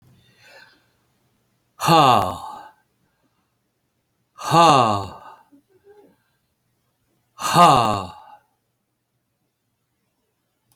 exhalation_length: 10.8 s
exhalation_amplitude: 31988
exhalation_signal_mean_std_ratio: 0.3
survey_phase: alpha (2021-03-01 to 2021-08-12)
age: 65+
gender: Male
wearing_mask: 'No'
symptom_cough_any: true
smoker_status: Ex-smoker
respiratory_condition_asthma: false
respiratory_condition_other: true
recruitment_source: REACT
submission_delay: 2 days
covid_test_result: Negative
covid_test_method: RT-qPCR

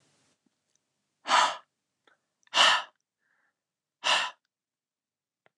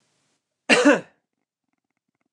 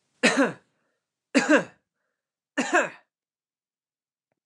exhalation_length: 5.6 s
exhalation_amplitude: 15440
exhalation_signal_mean_std_ratio: 0.28
cough_length: 2.3 s
cough_amplitude: 26463
cough_signal_mean_std_ratio: 0.27
three_cough_length: 4.5 s
three_cough_amplitude: 18742
three_cough_signal_mean_std_ratio: 0.32
survey_phase: beta (2021-08-13 to 2022-03-07)
age: 18-44
gender: Male
wearing_mask: 'No'
symptom_none: true
smoker_status: Never smoked
respiratory_condition_asthma: false
respiratory_condition_other: false
recruitment_source: REACT
submission_delay: 1 day
covid_test_result: Negative
covid_test_method: RT-qPCR
influenza_a_test_result: Unknown/Void
influenza_b_test_result: Unknown/Void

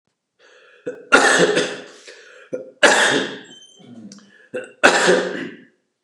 three_cough_length: 6.0 s
three_cough_amplitude: 32768
three_cough_signal_mean_std_ratio: 0.45
survey_phase: beta (2021-08-13 to 2022-03-07)
age: 45-64
gender: Male
wearing_mask: 'No'
symptom_cough_any: true
symptom_runny_or_blocked_nose: true
symptom_sore_throat: true
symptom_onset: 2 days
smoker_status: Never smoked
respiratory_condition_asthma: false
respiratory_condition_other: false
recruitment_source: Test and Trace
submission_delay: 1 day
covid_test_result: Positive
covid_test_method: RT-qPCR
covid_ct_value: 20.1
covid_ct_gene: ORF1ab gene
covid_ct_mean: 20.2
covid_viral_load: 240000 copies/ml
covid_viral_load_category: Low viral load (10K-1M copies/ml)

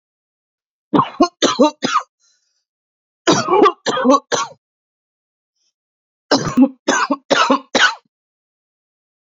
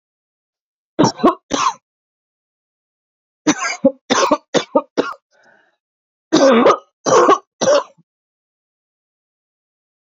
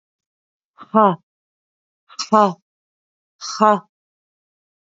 cough_length: 9.2 s
cough_amplitude: 32767
cough_signal_mean_std_ratio: 0.41
three_cough_length: 10.1 s
three_cough_amplitude: 32680
three_cough_signal_mean_std_ratio: 0.37
exhalation_length: 4.9 s
exhalation_amplitude: 30117
exhalation_signal_mean_std_ratio: 0.26
survey_phase: beta (2021-08-13 to 2022-03-07)
age: 45-64
gender: Female
wearing_mask: 'No'
symptom_runny_or_blocked_nose: true
symptom_headache: true
symptom_change_to_sense_of_smell_or_taste: true
smoker_status: Ex-smoker
respiratory_condition_asthma: false
respiratory_condition_other: false
recruitment_source: REACT
submission_delay: 2 days
covid_test_result: Negative
covid_test_method: RT-qPCR
influenza_a_test_result: Negative
influenza_b_test_result: Negative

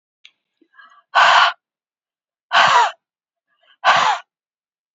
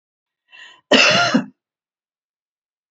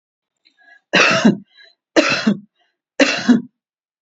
exhalation_length: 4.9 s
exhalation_amplitude: 32768
exhalation_signal_mean_std_ratio: 0.39
cough_length: 2.9 s
cough_amplitude: 30766
cough_signal_mean_std_ratio: 0.34
three_cough_length: 4.0 s
three_cough_amplitude: 32537
three_cough_signal_mean_std_ratio: 0.42
survey_phase: beta (2021-08-13 to 2022-03-07)
age: 65+
gender: Female
wearing_mask: 'No'
symptom_none: true
smoker_status: Ex-smoker
respiratory_condition_asthma: false
respiratory_condition_other: false
recruitment_source: REACT
submission_delay: 1 day
covid_test_result: Negative
covid_test_method: RT-qPCR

